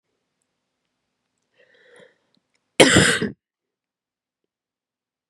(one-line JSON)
{"cough_length": "5.3 s", "cough_amplitude": 32768, "cough_signal_mean_std_ratio": 0.22, "survey_phase": "beta (2021-08-13 to 2022-03-07)", "age": "18-44", "gender": "Female", "wearing_mask": "No", "symptom_cough_any": true, "symptom_runny_or_blocked_nose": true, "symptom_shortness_of_breath": true, "symptom_sore_throat": true, "symptom_fatigue": true, "symptom_headache": true, "symptom_change_to_sense_of_smell_or_taste": true, "symptom_loss_of_taste": true, "symptom_onset": "4 days", "smoker_status": "Never smoked", "respiratory_condition_asthma": false, "respiratory_condition_other": false, "recruitment_source": "Test and Trace", "submission_delay": "1 day", "covid_test_result": "Positive", "covid_test_method": "ePCR"}